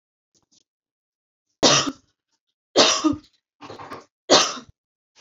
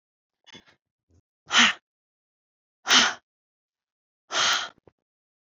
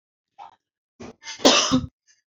{"three_cough_length": "5.2 s", "three_cough_amplitude": 28800, "three_cough_signal_mean_std_ratio": 0.32, "exhalation_length": "5.5 s", "exhalation_amplitude": 21945, "exhalation_signal_mean_std_ratio": 0.29, "cough_length": "2.3 s", "cough_amplitude": 28850, "cough_signal_mean_std_ratio": 0.34, "survey_phase": "alpha (2021-03-01 to 2021-08-12)", "age": "18-44", "gender": "Female", "wearing_mask": "No", "symptom_none": true, "smoker_status": "Never smoked", "respiratory_condition_asthma": false, "respiratory_condition_other": false, "recruitment_source": "Test and Trace", "submission_delay": "-1 day", "covid_test_result": "Negative", "covid_test_method": "LFT"}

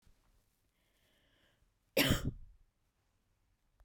{"cough_length": "3.8 s", "cough_amplitude": 5074, "cough_signal_mean_std_ratio": 0.24, "survey_phase": "beta (2021-08-13 to 2022-03-07)", "age": "18-44", "gender": "Female", "wearing_mask": "No", "symptom_cough_any": true, "symptom_sore_throat": true, "symptom_headache": true, "smoker_status": "Never smoked", "respiratory_condition_asthma": false, "respiratory_condition_other": false, "recruitment_source": "Test and Trace", "submission_delay": "2 days", "covid_test_result": "Positive", "covid_test_method": "RT-qPCR", "covid_ct_value": 28.2, "covid_ct_gene": "N gene", "covid_ct_mean": 28.2, "covid_viral_load": "560 copies/ml", "covid_viral_load_category": "Minimal viral load (< 10K copies/ml)"}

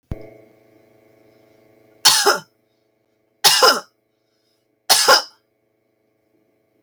{"three_cough_length": "6.8 s", "three_cough_amplitude": 32768, "three_cough_signal_mean_std_ratio": 0.3, "survey_phase": "beta (2021-08-13 to 2022-03-07)", "age": "45-64", "gender": "Female", "wearing_mask": "No", "symptom_none": true, "smoker_status": "Never smoked", "respiratory_condition_asthma": false, "respiratory_condition_other": false, "recruitment_source": "REACT", "submission_delay": "3 days", "covid_test_result": "Negative", "covid_test_method": "RT-qPCR"}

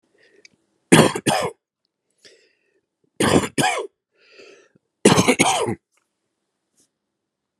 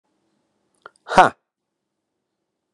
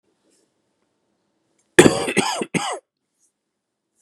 {"three_cough_length": "7.6 s", "three_cough_amplitude": 32768, "three_cough_signal_mean_std_ratio": 0.34, "exhalation_length": "2.7 s", "exhalation_amplitude": 32768, "exhalation_signal_mean_std_ratio": 0.16, "cough_length": "4.0 s", "cough_amplitude": 32768, "cough_signal_mean_std_ratio": 0.26, "survey_phase": "beta (2021-08-13 to 2022-03-07)", "age": "45-64", "gender": "Male", "wearing_mask": "No", "symptom_none": true, "smoker_status": "Current smoker (11 or more cigarettes per day)", "respiratory_condition_asthma": false, "respiratory_condition_other": false, "recruitment_source": "REACT", "submission_delay": "2 days", "covid_test_result": "Negative", "covid_test_method": "RT-qPCR"}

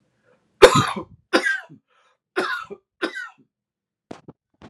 {"three_cough_length": "4.7 s", "three_cough_amplitude": 32768, "three_cough_signal_mean_std_ratio": 0.28, "survey_phase": "alpha (2021-03-01 to 2021-08-12)", "age": "45-64", "gender": "Male", "wearing_mask": "No", "symptom_none": true, "symptom_onset": "8 days", "smoker_status": "Never smoked", "respiratory_condition_asthma": false, "respiratory_condition_other": false, "recruitment_source": "REACT", "submission_delay": "3 days", "covid_test_result": "Negative", "covid_test_method": "RT-qPCR"}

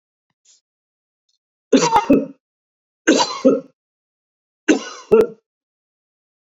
{"three_cough_length": "6.6 s", "three_cough_amplitude": 27710, "three_cough_signal_mean_std_ratio": 0.33, "survey_phase": "beta (2021-08-13 to 2022-03-07)", "age": "65+", "gender": "Male", "wearing_mask": "No", "symptom_none": true, "smoker_status": "Ex-smoker", "respiratory_condition_asthma": false, "respiratory_condition_other": false, "recruitment_source": "REACT", "submission_delay": "2 days", "covid_test_result": "Negative", "covid_test_method": "RT-qPCR"}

